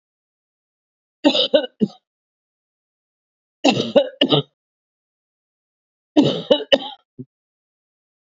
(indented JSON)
{
  "three_cough_length": "8.3 s",
  "three_cough_amplitude": 32024,
  "three_cough_signal_mean_std_ratio": 0.3,
  "survey_phase": "beta (2021-08-13 to 2022-03-07)",
  "age": "45-64",
  "gender": "Female",
  "wearing_mask": "No",
  "symptom_cough_any": true,
  "symptom_runny_or_blocked_nose": true,
  "symptom_sore_throat": true,
  "symptom_abdominal_pain": true,
  "symptom_fatigue": true,
  "symptom_headache": true,
  "symptom_change_to_sense_of_smell_or_taste": true,
  "smoker_status": "Never smoked",
  "respiratory_condition_asthma": false,
  "respiratory_condition_other": false,
  "recruitment_source": "Test and Trace",
  "submission_delay": "1 day",
  "covid_test_result": "Positive",
  "covid_test_method": "RT-qPCR",
  "covid_ct_value": 18.2,
  "covid_ct_gene": "S gene",
  "covid_ct_mean": 19.5,
  "covid_viral_load": "390000 copies/ml",
  "covid_viral_load_category": "Low viral load (10K-1M copies/ml)"
}